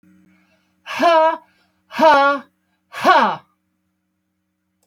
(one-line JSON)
{"exhalation_length": "4.9 s", "exhalation_amplitude": 32768, "exhalation_signal_mean_std_ratio": 0.41, "survey_phase": "alpha (2021-03-01 to 2021-08-12)", "age": "45-64", "gender": "Female", "wearing_mask": "No", "symptom_none": true, "smoker_status": "Never smoked", "respiratory_condition_asthma": true, "respiratory_condition_other": false, "recruitment_source": "REACT", "submission_delay": "2 days", "covid_test_result": "Negative", "covid_test_method": "RT-qPCR"}